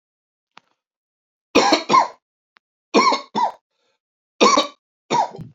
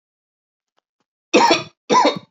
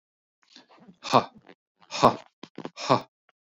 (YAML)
three_cough_length: 5.5 s
three_cough_amplitude: 27754
three_cough_signal_mean_std_ratio: 0.39
cough_length: 2.3 s
cough_amplitude: 30255
cough_signal_mean_std_ratio: 0.4
exhalation_length: 3.4 s
exhalation_amplitude: 24961
exhalation_signal_mean_std_ratio: 0.26
survey_phase: beta (2021-08-13 to 2022-03-07)
age: 45-64
gender: Male
wearing_mask: 'No'
symptom_none: true
smoker_status: Never smoked
respiratory_condition_asthma: false
respiratory_condition_other: false
recruitment_source: Test and Trace
submission_delay: 1 day
covid_test_result: Negative
covid_test_method: RT-qPCR